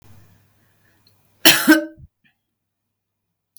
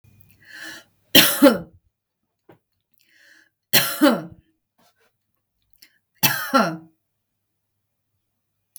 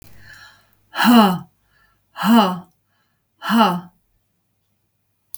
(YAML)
cough_length: 3.6 s
cough_amplitude: 32768
cough_signal_mean_std_ratio: 0.24
three_cough_length: 8.8 s
three_cough_amplitude: 32768
three_cough_signal_mean_std_ratio: 0.27
exhalation_length: 5.4 s
exhalation_amplitude: 32768
exhalation_signal_mean_std_ratio: 0.38
survey_phase: beta (2021-08-13 to 2022-03-07)
age: 45-64
gender: Female
wearing_mask: 'No'
symptom_sore_throat: true
symptom_headache: true
smoker_status: Never smoked
respiratory_condition_asthma: false
respiratory_condition_other: false
recruitment_source: REACT
submission_delay: 7 days
covid_test_result: Negative
covid_test_method: RT-qPCR
influenza_a_test_result: Negative
influenza_b_test_result: Negative